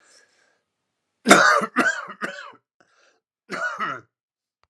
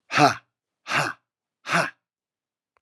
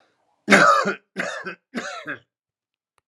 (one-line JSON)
{"cough_length": "4.7 s", "cough_amplitude": 32768, "cough_signal_mean_std_ratio": 0.33, "exhalation_length": "2.8 s", "exhalation_amplitude": 26500, "exhalation_signal_mean_std_ratio": 0.34, "three_cough_length": "3.1 s", "three_cough_amplitude": 32768, "three_cough_signal_mean_std_ratio": 0.38, "survey_phase": "alpha (2021-03-01 to 2021-08-12)", "age": "45-64", "gender": "Male", "wearing_mask": "No", "symptom_cough_any": true, "symptom_diarrhoea": true, "symptom_fatigue": true, "symptom_headache": true, "symptom_change_to_sense_of_smell_or_taste": true, "symptom_onset": "4 days", "smoker_status": "Current smoker (e-cigarettes or vapes only)", "respiratory_condition_asthma": false, "respiratory_condition_other": false, "recruitment_source": "Test and Trace", "submission_delay": "2 days", "covid_test_result": "Positive", "covid_test_method": "RT-qPCR", "covid_ct_value": 16.5, "covid_ct_gene": "ORF1ab gene", "covid_ct_mean": 17.1, "covid_viral_load": "2500000 copies/ml", "covid_viral_load_category": "High viral load (>1M copies/ml)"}